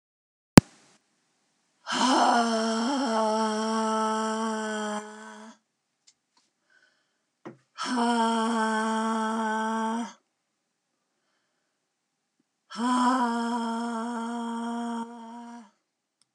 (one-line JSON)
{"exhalation_length": "16.3 s", "exhalation_amplitude": 32768, "exhalation_signal_mean_std_ratio": 0.56, "survey_phase": "beta (2021-08-13 to 2022-03-07)", "age": "45-64", "gender": "Female", "wearing_mask": "No", "symptom_cough_any": true, "symptom_new_continuous_cough": true, "symptom_runny_or_blocked_nose": true, "symptom_fatigue": true, "symptom_headache": true, "symptom_onset": "9 days", "smoker_status": "Never smoked", "respiratory_condition_asthma": false, "respiratory_condition_other": false, "recruitment_source": "Test and Trace", "submission_delay": "2 days", "covid_test_result": "Positive", "covid_test_method": "RT-qPCR", "covid_ct_value": 17.7, "covid_ct_gene": "ORF1ab gene", "covid_ct_mean": 18.2, "covid_viral_load": "1100000 copies/ml", "covid_viral_load_category": "High viral load (>1M copies/ml)"}